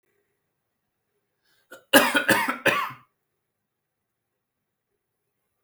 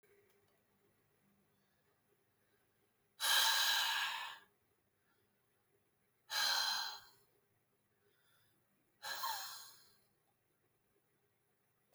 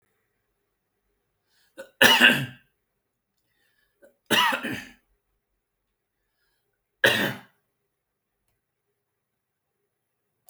{"cough_length": "5.6 s", "cough_amplitude": 29525, "cough_signal_mean_std_ratio": 0.27, "exhalation_length": "11.9 s", "exhalation_amplitude": 2970, "exhalation_signal_mean_std_ratio": 0.35, "three_cough_length": "10.5 s", "three_cough_amplitude": 28460, "three_cough_signal_mean_std_ratio": 0.24, "survey_phase": "beta (2021-08-13 to 2022-03-07)", "age": "45-64", "gender": "Male", "wearing_mask": "No", "symptom_none": true, "smoker_status": "Never smoked", "respiratory_condition_asthma": true, "respiratory_condition_other": false, "recruitment_source": "REACT", "submission_delay": "0 days", "covid_test_result": "Negative", "covid_test_method": "RT-qPCR"}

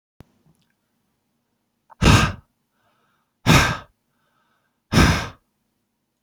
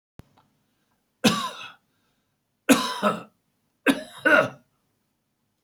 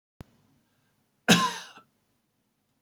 {"exhalation_length": "6.2 s", "exhalation_amplitude": 29711, "exhalation_signal_mean_std_ratio": 0.3, "three_cough_length": "5.6 s", "three_cough_amplitude": 22118, "three_cough_signal_mean_std_ratio": 0.32, "cough_length": "2.8 s", "cough_amplitude": 24498, "cough_signal_mean_std_ratio": 0.23, "survey_phase": "beta (2021-08-13 to 2022-03-07)", "age": "65+", "gender": "Male", "wearing_mask": "No", "symptom_none": true, "smoker_status": "Ex-smoker", "respiratory_condition_asthma": false, "respiratory_condition_other": false, "recruitment_source": "REACT", "submission_delay": "2 days", "covid_test_result": "Negative", "covid_test_method": "RT-qPCR", "influenza_a_test_result": "Negative", "influenza_b_test_result": "Negative"}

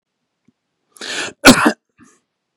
{"cough_length": "2.6 s", "cough_amplitude": 32768, "cough_signal_mean_std_ratio": 0.27, "survey_phase": "beta (2021-08-13 to 2022-03-07)", "age": "18-44", "gender": "Male", "wearing_mask": "No", "symptom_none": true, "smoker_status": "Never smoked", "respiratory_condition_asthma": false, "respiratory_condition_other": false, "recruitment_source": "REACT", "submission_delay": "3 days", "covid_test_result": "Negative", "covid_test_method": "RT-qPCR"}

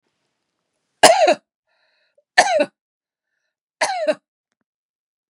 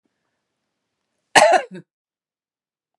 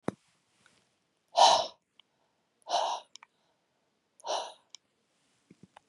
{"three_cough_length": "5.3 s", "three_cough_amplitude": 32768, "three_cough_signal_mean_std_ratio": 0.3, "cough_length": "3.0 s", "cough_amplitude": 32768, "cough_signal_mean_std_ratio": 0.24, "exhalation_length": "5.9 s", "exhalation_amplitude": 13981, "exhalation_signal_mean_std_ratio": 0.26, "survey_phase": "beta (2021-08-13 to 2022-03-07)", "age": "45-64", "gender": "Female", "wearing_mask": "No", "symptom_none": true, "smoker_status": "Never smoked", "respiratory_condition_asthma": false, "respiratory_condition_other": false, "recruitment_source": "REACT", "submission_delay": "1 day", "covid_test_result": "Negative", "covid_test_method": "RT-qPCR"}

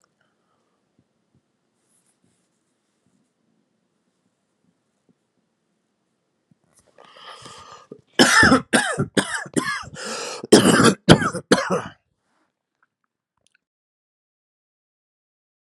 {"cough_length": "15.7 s", "cough_amplitude": 32768, "cough_signal_mean_std_ratio": 0.27, "survey_phase": "beta (2021-08-13 to 2022-03-07)", "age": "18-44", "gender": "Male", "wearing_mask": "No", "symptom_none": true, "symptom_onset": "12 days", "smoker_status": "Ex-smoker", "respiratory_condition_asthma": true, "respiratory_condition_other": false, "recruitment_source": "Test and Trace", "submission_delay": "5 days", "covid_test_method": "RT-qPCR"}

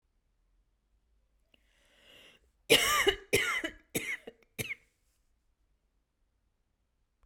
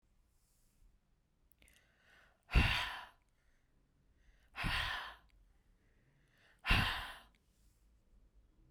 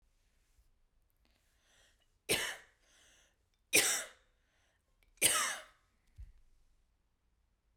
{"cough_length": "7.3 s", "cough_amplitude": 11272, "cough_signal_mean_std_ratio": 0.29, "exhalation_length": "8.7 s", "exhalation_amplitude": 4747, "exhalation_signal_mean_std_ratio": 0.31, "three_cough_length": "7.8 s", "three_cough_amplitude": 6676, "three_cough_signal_mean_std_ratio": 0.27, "survey_phase": "beta (2021-08-13 to 2022-03-07)", "age": "18-44", "gender": "Female", "wearing_mask": "No", "symptom_sore_throat": true, "smoker_status": "Never smoked", "respiratory_condition_asthma": false, "respiratory_condition_other": false, "recruitment_source": "Test and Trace", "submission_delay": "1 day", "covid_test_result": "Positive", "covid_test_method": "RT-qPCR", "covid_ct_value": 34.6, "covid_ct_gene": "ORF1ab gene"}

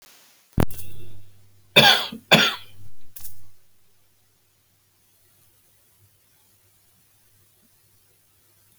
{"cough_length": "8.8 s", "cough_amplitude": 31603, "cough_signal_mean_std_ratio": 0.35, "survey_phase": "beta (2021-08-13 to 2022-03-07)", "age": "65+", "gender": "Male", "wearing_mask": "No", "symptom_none": true, "smoker_status": "Ex-smoker", "respiratory_condition_asthma": false, "respiratory_condition_other": false, "recruitment_source": "REACT", "submission_delay": "1 day", "covid_test_result": "Negative", "covid_test_method": "RT-qPCR"}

